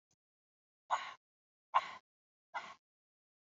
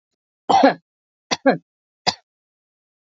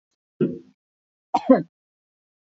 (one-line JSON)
{"exhalation_length": "3.6 s", "exhalation_amplitude": 4586, "exhalation_signal_mean_std_ratio": 0.22, "three_cough_length": "3.1 s", "three_cough_amplitude": 28005, "three_cough_signal_mean_std_ratio": 0.28, "cough_length": "2.5 s", "cough_amplitude": 27069, "cough_signal_mean_std_ratio": 0.25, "survey_phase": "beta (2021-08-13 to 2022-03-07)", "age": "45-64", "gender": "Female", "wearing_mask": "No", "symptom_none": true, "smoker_status": "Never smoked", "respiratory_condition_asthma": false, "respiratory_condition_other": false, "recruitment_source": "REACT", "submission_delay": "4 days", "covid_test_result": "Negative", "covid_test_method": "RT-qPCR"}